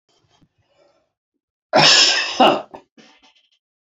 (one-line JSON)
{"cough_length": "3.8 s", "cough_amplitude": 31405, "cough_signal_mean_std_ratio": 0.36, "survey_phase": "beta (2021-08-13 to 2022-03-07)", "age": "65+", "gender": "Male", "wearing_mask": "No", "symptom_cough_any": true, "smoker_status": "Never smoked", "respiratory_condition_asthma": false, "respiratory_condition_other": true, "recruitment_source": "REACT", "submission_delay": "1 day", "covid_test_result": "Negative", "covid_test_method": "RT-qPCR"}